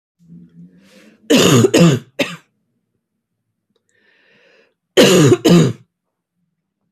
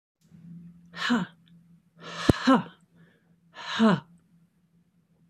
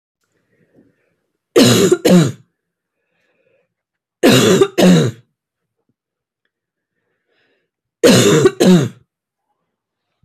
cough_length: 6.9 s
cough_amplitude: 32768
cough_signal_mean_std_ratio: 0.39
exhalation_length: 5.3 s
exhalation_amplitude: 29665
exhalation_signal_mean_std_ratio: 0.33
three_cough_length: 10.2 s
three_cough_amplitude: 32767
three_cough_signal_mean_std_ratio: 0.4
survey_phase: beta (2021-08-13 to 2022-03-07)
age: 18-44
gender: Female
wearing_mask: 'No'
symptom_none: true
symptom_onset: 11 days
smoker_status: Never smoked
respiratory_condition_asthma: false
respiratory_condition_other: false
recruitment_source: REACT
submission_delay: 2 days
covid_test_result: Negative
covid_test_method: RT-qPCR
influenza_a_test_result: Unknown/Void
influenza_b_test_result: Unknown/Void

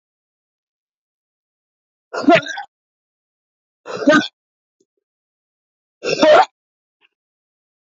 exhalation_length: 7.9 s
exhalation_amplitude: 28749
exhalation_signal_mean_std_ratio: 0.26
survey_phase: beta (2021-08-13 to 2022-03-07)
age: 65+
gender: Female
wearing_mask: 'No'
symptom_cough_any: true
symptom_fatigue: true
smoker_status: Ex-smoker
respiratory_condition_asthma: true
respiratory_condition_other: true
recruitment_source: REACT
submission_delay: 1 day
covid_test_result: Negative
covid_test_method: RT-qPCR
influenza_a_test_result: Negative
influenza_b_test_result: Negative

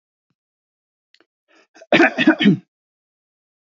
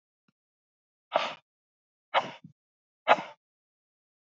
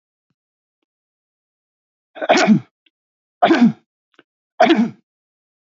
cough_length: 3.8 s
cough_amplitude: 28415
cough_signal_mean_std_ratio: 0.29
exhalation_length: 4.3 s
exhalation_amplitude: 18779
exhalation_signal_mean_std_ratio: 0.21
three_cough_length: 5.6 s
three_cough_amplitude: 32048
three_cough_signal_mean_std_ratio: 0.33
survey_phase: beta (2021-08-13 to 2022-03-07)
age: 65+
gender: Male
wearing_mask: 'No'
symptom_none: true
smoker_status: Never smoked
respiratory_condition_asthma: false
respiratory_condition_other: false
recruitment_source: Test and Trace
submission_delay: 0 days
covid_test_result: Negative
covid_test_method: LFT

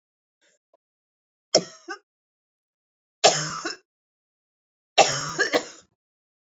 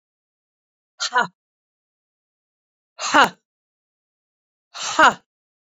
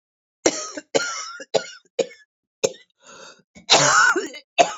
three_cough_length: 6.5 s
three_cough_amplitude: 26629
three_cough_signal_mean_std_ratio: 0.27
exhalation_length: 5.6 s
exhalation_amplitude: 27595
exhalation_signal_mean_std_ratio: 0.24
cough_length: 4.8 s
cough_amplitude: 27343
cough_signal_mean_std_ratio: 0.41
survey_phase: beta (2021-08-13 to 2022-03-07)
age: 45-64
gender: Female
wearing_mask: 'No'
symptom_cough_any: true
symptom_shortness_of_breath: true
symptom_sore_throat: true
symptom_fever_high_temperature: true
symptom_headache: true
smoker_status: Ex-smoker
respiratory_condition_asthma: true
respiratory_condition_other: false
recruitment_source: REACT
submission_delay: 2 days
covid_test_result: Negative
covid_test_method: RT-qPCR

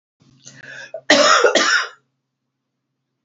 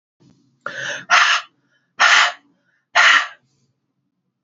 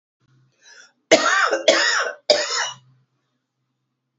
cough_length: 3.2 s
cough_amplitude: 30260
cough_signal_mean_std_ratio: 0.41
exhalation_length: 4.4 s
exhalation_amplitude: 31464
exhalation_signal_mean_std_ratio: 0.4
three_cough_length: 4.2 s
three_cough_amplitude: 30418
three_cough_signal_mean_std_ratio: 0.43
survey_phase: beta (2021-08-13 to 2022-03-07)
age: 45-64
gender: Female
wearing_mask: 'No'
symptom_cough_any: true
symptom_runny_or_blocked_nose: true
symptom_fatigue: true
symptom_change_to_sense_of_smell_or_taste: true
symptom_loss_of_taste: true
symptom_onset: 6 days
smoker_status: Never smoked
respiratory_condition_asthma: false
respiratory_condition_other: false
recruitment_source: Test and Trace
submission_delay: 2 days
covid_test_result: Positive
covid_test_method: ePCR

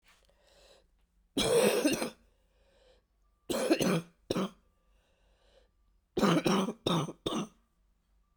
three_cough_length: 8.4 s
three_cough_amplitude: 7477
three_cough_signal_mean_std_ratio: 0.44
survey_phase: beta (2021-08-13 to 2022-03-07)
age: 18-44
gender: Female
wearing_mask: 'No'
symptom_cough_any: true
symptom_runny_or_blocked_nose: true
symptom_shortness_of_breath: true
symptom_sore_throat: true
symptom_headache: true
symptom_change_to_sense_of_smell_or_taste: true
symptom_loss_of_taste: true
symptom_onset: 4 days
smoker_status: Never smoked
respiratory_condition_asthma: false
respiratory_condition_other: false
recruitment_source: Test and Trace
submission_delay: 2 days
covid_test_result: Positive
covid_test_method: RT-qPCR
covid_ct_value: 12.9
covid_ct_gene: N gene
covid_ct_mean: 13.6
covid_viral_load: 34000000 copies/ml
covid_viral_load_category: High viral load (>1M copies/ml)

